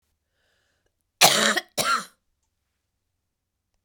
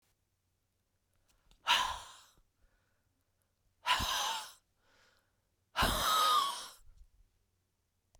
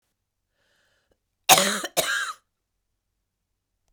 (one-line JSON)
{"cough_length": "3.8 s", "cough_amplitude": 32768, "cough_signal_mean_std_ratio": 0.29, "exhalation_length": "8.2 s", "exhalation_amplitude": 6099, "exhalation_signal_mean_std_ratio": 0.38, "three_cough_length": "3.9 s", "three_cough_amplitude": 32768, "three_cough_signal_mean_std_ratio": 0.27, "survey_phase": "beta (2021-08-13 to 2022-03-07)", "age": "65+", "gender": "Female", "wearing_mask": "No", "symptom_cough_any": true, "symptom_runny_or_blocked_nose": true, "symptom_fatigue": true, "symptom_headache": true, "symptom_other": true, "smoker_status": "Ex-smoker", "respiratory_condition_asthma": false, "respiratory_condition_other": true, "recruitment_source": "Test and Trace", "submission_delay": "1 day", "covid_test_result": "Positive", "covid_test_method": "LFT"}